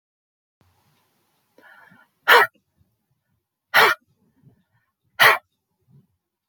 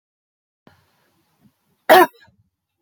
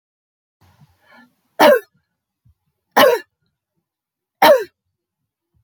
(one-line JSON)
{"exhalation_length": "6.5 s", "exhalation_amplitude": 26975, "exhalation_signal_mean_std_ratio": 0.23, "cough_length": "2.8 s", "cough_amplitude": 28626, "cough_signal_mean_std_ratio": 0.21, "three_cough_length": "5.6 s", "three_cough_amplitude": 31854, "three_cough_signal_mean_std_ratio": 0.27, "survey_phase": "beta (2021-08-13 to 2022-03-07)", "age": "45-64", "gender": "Female", "wearing_mask": "No", "symptom_none": true, "smoker_status": "Ex-smoker", "respiratory_condition_asthma": false, "respiratory_condition_other": false, "recruitment_source": "REACT", "submission_delay": "1 day", "covid_test_result": "Negative", "covid_test_method": "RT-qPCR"}